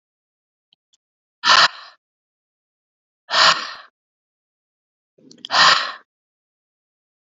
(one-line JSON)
{"exhalation_length": "7.3 s", "exhalation_amplitude": 32767, "exhalation_signal_mean_std_ratio": 0.28, "survey_phase": "beta (2021-08-13 to 2022-03-07)", "age": "45-64", "gender": "Female", "wearing_mask": "No", "symptom_cough_any": true, "symptom_sore_throat": true, "symptom_headache": true, "symptom_change_to_sense_of_smell_or_taste": true, "smoker_status": "Ex-smoker", "respiratory_condition_asthma": false, "respiratory_condition_other": false, "recruitment_source": "Test and Trace", "submission_delay": "1 day", "covid_test_result": "Positive", "covid_test_method": "RT-qPCR", "covid_ct_value": 33.4, "covid_ct_gene": "ORF1ab gene", "covid_ct_mean": 34.1, "covid_viral_load": "6.6 copies/ml", "covid_viral_load_category": "Minimal viral load (< 10K copies/ml)"}